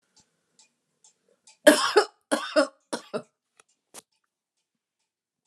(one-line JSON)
{"cough_length": "5.5 s", "cough_amplitude": 27220, "cough_signal_mean_std_ratio": 0.24, "survey_phase": "alpha (2021-03-01 to 2021-08-12)", "age": "65+", "gender": "Female", "wearing_mask": "No", "symptom_none": true, "smoker_status": "Ex-smoker", "respiratory_condition_asthma": false, "respiratory_condition_other": false, "recruitment_source": "REACT", "submission_delay": "1 day", "covid_test_result": "Negative", "covid_test_method": "RT-qPCR"}